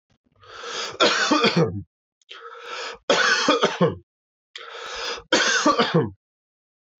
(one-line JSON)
{"three_cough_length": "7.0 s", "three_cough_amplitude": 19552, "three_cough_signal_mean_std_ratio": 0.54, "survey_phase": "alpha (2021-03-01 to 2021-08-12)", "age": "18-44", "gender": "Male", "wearing_mask": "No", "symptom_none": true, "smoker_status": "Never smoked", "respiratory_condition_asthma": false, "respiratory_condition_other": false, "recruitment_source": "REACT", "submission_delay": "2 days", "covid_test_result": "Negative", "covid_test_method": "RT-qPCR"}